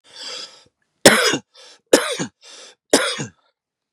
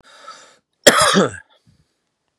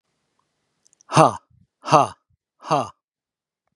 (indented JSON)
{
  "three_cough_length": "3.9 s",
  "three_cough_amplitude": 32768,
  "three_cough_signal_mean_std_ratio": 0.34,
  "cough_length": "2.4 s",
  "cough_amplitude": 32768,
  "cough_signal_mean_std_ratio": 0.33,
  "exhalation_length": "3.8 s",
  "exhalation_amplitude": 32563,
  "exhalation_signal_mean_std_ratio": 0.26,
  "survey_phase": "beta (2021-08-13 to 2022-03-07)",
  "age": "45-64",
  "gender": "Male",
  "wearing_mask": "No",
  "symptom_none": true,
  "smoker_status": "Never smoked",
  "respiratory_condition_asthma": false,
  "respiratory_condition_other": false,
  "recruitment_source": "REACT",
  "submission_delay": "1 day",
  "covid_test_result": "Negative",
  "covid_test_method": "RT-qPCR",
  "influenza_a_test_result": "Negative",
  "influenza_b_test_result": "Negative"
}